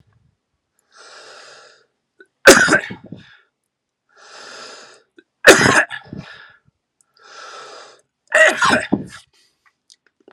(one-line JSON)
{"three_cough_length": "10.3 s", "three_cough_amplitude": 32768, "three_cough_signal_mean_std_ratio": 0.29, "survey_phase": "alpha (2021-03-01 to 2021-08-12)", "age": "45-64", "gender": "Male", "wearing_mask": "No", "symptom_cough_any": true, "symptom_onset": "2 days", "smoker_status": "Never smoked", "respiratory_condition_asthma": true, "respiratory_condition_other": false, "recruitment_source": "Test and Trace", "submission_delay": "2 days", "covid_test_result": "Positive", "covid_test_method": "RT-qPCR"}